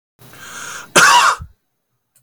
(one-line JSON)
{"cough_length": "2.2 s", "cough_amplitude": 32768, "cough_signal_mean_std_ratio": 0.41, "survey_phase": "beta (2021-08-13 to 2022-03-07)", "age": "45-64", "gender": "Male", "wearing_mask": "No", "symptom_none": true, "smoker_status": "Ex-smoker", "respiratory_condition_asthma": false, "respiratory_condition_other": false, "recruitment_source": "REACT", "submission_delay": "1 day", "covid_test_result": "Negative", "covid_test_method": "RT-qPCR", "influenza_a_test_result": "Negative", "influenza_b_test_result": "Negative"}